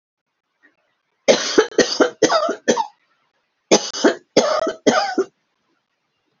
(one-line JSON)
{"cough_length": "6.4 s", "cough_amplitude": 32768, "cough_signal_mean_std_ratio": 0.43, "survey_phase": "alpha (2021-03-01 to 2021-08-12)", "age": "45-64", "gender": "Female", "wearing_mask": "No", "symptom_none": true, "smoker_status": "Never smoked", "respiratory_condition_asthma": false, "respiratory_condition_other": false, "recruitment_source": "REACT", "submission_delay": "1 day", "covid_test_result": "Negative", "covid_test_method": "RT-qPCR"}